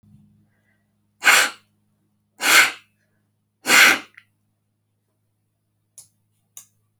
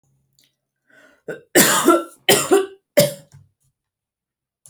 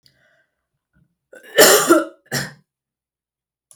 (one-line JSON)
{"exhalation_length": "7.0 s", "exhalation_amplitude": 30883, "exhalation_signal_mean_std_ratio": 0.27, "three_cough_length": "4.7 s", "three_cough_amplitude": 32768, "three_cough_signal_mean_std_ratio": 0.36, "cough_length": "3.8 s", "cough_amplitude": 32768, "cough_signal_mean_std_ratio": 0.3, "survey_phase": "alpha (2021-03-01 to 2021-08-12)", "age": "18-44", "gender": "Female", "wearing_mask": "No", "symptom_none": true, "smoker_status": "Never smoked", "respiratory_condition_asthma": false, "respiratory_condition_other": false, "recruitment_source": "REACT", "submission_delay": "1 day", "covid_test_result": "Negative", "covid_test_method": "RT-qPCR"}